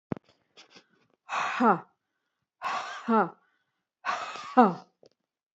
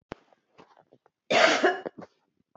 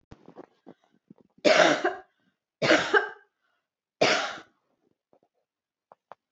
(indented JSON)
{
  "exhalation_length": "5.5 s",
  "exhalation_amplitude": 20086,
  "exhalation_signal_mean_std_ratio": 0.34,
  "cough_length": "2.6 s",
  "cough_amplitude": 25032,
  "cough_signal_mean_std_ratio": 0.35,
  "three_cough_length": "6.3 s",
  "three_cough_amplitude": 18065,
  "three_cough_signal_mean_std_ratio": 0.33,
  "survey_phase": "beta (2021-08-13 to 2022-03-07)",
  "age": "45-64",
  "gender": "Female",
  "wearing_mask": "No",
  "symptom_none": true,
  "smoker_status": "Ex-smoker",
  "respiratory_condition_asthma": false,
  "respiratory_condition_other": false,
  "recruitment_source": "Test and Trace",
  "submission_delay": "1 day",
  "covid_test_result": "Negative",
  "covid_test_method": "RT-qPCR"
}